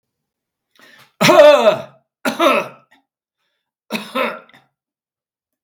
{"cough_length": "5.6 s", "cough_amplitude": 32768, "cough_signal_mean_std_ratio": 0.35, "survey_phase": "beta (2021-08-13 to 2022-03-07)", "age": "65+", "gender": "Male", "wearing_mask": "No", "symptom_none": true, "smoker_status": "Ex-smoker", "respiratory_condition_asthma": false, "respiratory_condition_other": false, "recruitment_source": "REACT", "submission_delay": "5 days", "covid_test_result": "Negative", "covid_test_method": "RT-qPCR", "influenza_a_test_result": "Unknown/Void", "influenza_b_test_result": "Unknown/Void"}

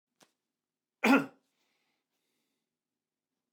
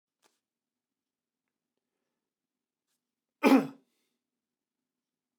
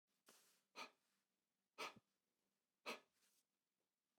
{"cough_length": "3.5 s", "cough_amplitude": 9307, "cough_signal_mean_std_ratio": 0.18, "three_cough_length": "5.4 s", "three_cough_amplitude": 10323, "three_cough_signal_mean_std_ratio": 0.15, "exhalation_length": "4.2 s", "exhalation_amplitude": 426, "exhalation_signal_mean_std_ratio": 0.26, "survey_phase": "beta (2021-08-13 to 2022-03-07)", "age": "45-64", "gender": "Male", "wearing_mask": "No", "symptom_none": true, "smoker_status": "Never smoked", "respiratory_condition_asthma": false, "respiratory_condition_other": false, "recruitment_source": "REACT", "submission_delay": "1 day", "covid_test_result": "Negative", "covid_test_method": "RT-qPCR"}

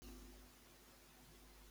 {"cough_length": "1.7 s", "cough_amplitude": 177, "cough_signal_mean_std_ratio": 1.1, "survey_phase": "beta (2021-08-13 to 2022-03-07)", "age": "45-64", "gender": "Male", "wearing_mask": "No", "symptom_none": true, "smoker_status": "Never smoked", "respiratory_condition_asthma": false, "respiratory_condition_other": false, "recruitment_source": "REACT", "submission_delay": "2 days", "covid_test_result": "Negative", "covid_test_method": "RT-qPCR", "influenza_a_test_result": "Negative", "influenza_b_test_result": "Negative"}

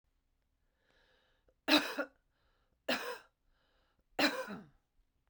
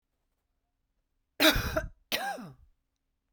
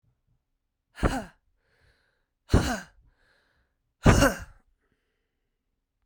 {"three_cough_length": "5.3 s", "three_cough_amplitude": 7282, "three_cough_signal_mean_std_ratio": 0.29, "cough_length": "3.3 s", "cough_amplitude": 12048, "cough_signal_mean_std_ratio": 0.32, "exhalation_length": "6.1 s", "exhalation_amplitude": 20486, "exhalation_signal_mean_std_ratio": 0.25, "survey_phase": "beta (2021-08-13 to 2022-03-07)", "age": "45-64", "gender": "Female", "wearing_mask": "No", "symptom_cough_any": true, "symptom_runny_or_blocked_nose": true, "symptom_shortness_of_breath": true, "symptom_diarrhoea": true, "symptom_fatigue": true, "symptom_headache": true, "symptom_change_to_sense_of_smell_or_taste": true, "symptom_loss_of_taste": true, "smoker_status": "Current smoker (e-cigarettes or vapes only)", "respiratory_condition_asthma": false, "respiratory_condition_other": false, "recruitment_source": "Test and Trace", "submission_delay": "2 days", "covid_test_result": "Positive", "covid_test_method": "RT-qPCR", "covid_ct_value": 18.5, "covid_ct_gene": "ORF1ab gene"}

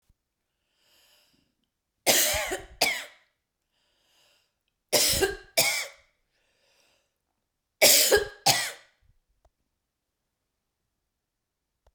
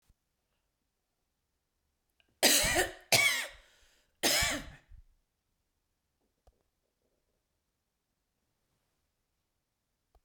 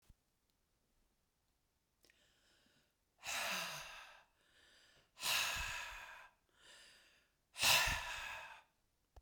{"three_cough_length": "11.9 s", "three_cough_amplitude": 21091, "three_cough_signal_mean_std_ratio": 0.31, "cough_length": "10.2 s", "cough_amplitude": 11262, "cough_signal_mean_std_ratio": 0.27, "exhalation_length": "9.2 s", "exhalation_amplitude": 3596, "exhalation_signal_mean_std_ratio": 0.37, "survey_phase": "beta (2021-08-13 to 2022-03-07)", "age": "45-64", "gender": "Female", "wearing_mask": "No", "symptom_shortness_of_breath": true, "symptom_fatigue": true, "symptom_onset": "7 days", "smoker_status": "Never smoked", "respiratory_condition_asthma": true, "respiratory_condition_other": false, "recruitment_source": "REACT", "submission_delay": "3 days", "covid_test_result": "Negative", "covid_test_method": "RT-qPCR", "influenza_a_test_result": "Negative", "influenza_b_test_result": "Negative"}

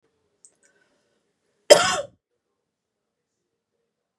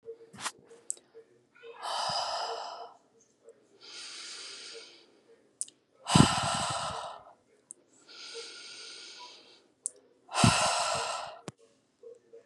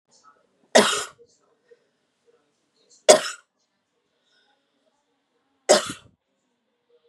{"cough_length": "4.2 s", "cough_amplitude": 32768, "cough_signal_mean_std_ratio": 0.16, "exhalation_length": "12.5 s", "exhalation_amplitude": 20667, "exhalation_signal_mean_std_ratio": 0.4, "three_cough_length": "7.1 s", "three_cough_amplitude": 32767, "three_cough_signal_mean_std_ratio": 0.2, "survey_phase": "beta (2021-08-13 to 2022-03-07)", "age": "18-44", "gender": "Female", "wearing_mask": "No", "symptom_none": true, "smoker_status": "Never smoked", "respiratory_condition_asthma": false, "respiratory_condition_other": false, "recruitment_source": "REACT", "submission_delay": "2 days", "covid_test_result": "Negative", "covid_test_method": "RT-qPCR", "influenza_a_test_result": "Negative", "influenza_b_test_result": "Negative"}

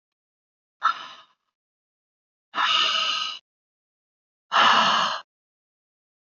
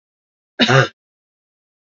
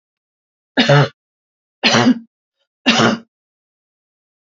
{"exhalation_length": "6.3 s", "exhalation_amplitude": 19200, "exhalation_signal_mean_std_ratio": 0.4, "cough_length": "2.0 s", "cough_amplitude": 29421, "cough_signal_mean_std_ratio": 0.29, "three_cough_length": "4.4 s", "three_cough_amplitude": 31222, "three_cough_signal_mean_std_ratio": 0.37, "survey_phase": "alpha (2021-03-01 to 2021-08-12)", "age": "65+", "gender": "Female", "wearing_mask": "No", "symptom_change_to_sense_of_smell_or_taste": true, "symptom_loss_of_taste": true, "smoker_status": "Never smoked", "respiratory_condition_asthma": false, "respiratory_condition_other": false, "recruitment_source": "REACT", "submission_delay": "3 days", "covid_test_result": "Negative", "covid_test_method": "RT-qPCR"}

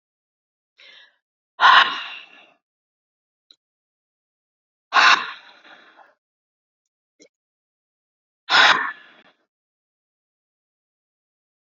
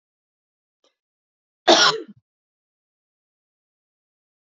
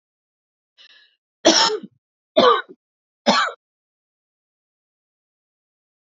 {"exhalation_length": "11.7 s", "exhalation_amplitude": 28315, "exhalation_signal_mean_std_ratio": 0.23, "cough_length": "4.5 s", "cough_amplitude": 28582, "cough_signal_mean_std_ratio": 0.19, "three_cough_length": "6.1 s", "three_cough_amplitude": 30103, "three_cough_signal_mean_std_ratio": 0.28, "survey_phase": "beta (2021-08-13 to 2022-03-07)", "age": "18-44", "gender": "Female", "wearing_mask": "No", "symptom_runny_or_blocked_nose": true, "symptom_fatigue": true, "symptom_fever_high_temperature": true, "symptom_headache": true, "symptom_loss_of_taste": true, "symptom_other": true, "symptom_onset": "4 days", "smoker_status": "Never smoked", "respiratory_condition_asthma": false, "respiratory_condition_other": false, "recruitment_source": "Test and Trace", "submission_delay": "2 days", "covid_test_result": "Positive", "covid_test_method": "RT-qPCR"}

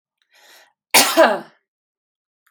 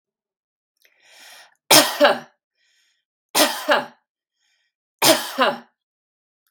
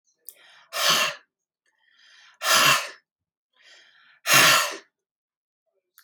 {"cough_length": "2.5 s", "cough_amplitude": 32768, "cough_signal_mean_std_ratio": 0.31, "three_cough_length": "6.5 s", "three_cough_amplitude": 32768, "three_cough_signal_mean_std_ratio": 0.32, "exhalation_length": "6.0 s", "exhalation_amplitude": 24691, "exhalation_signal_mean_std_ratio": 0.36, "survey_phase": "beta (2021-08-13 to 2022-03-07)", "age": "45-64", "gender": "Female", "wearing_mask": "No", "symptom_none": true, "smoker_status": "Never smoked", "respiratory_condition_asthma": false, "respiratory_condition_other": false, "recruitment_source": "REACT", "submission_delay": "2 days", "covid_test_result": "Negative", "covid_test_method": "RT-qPCR"}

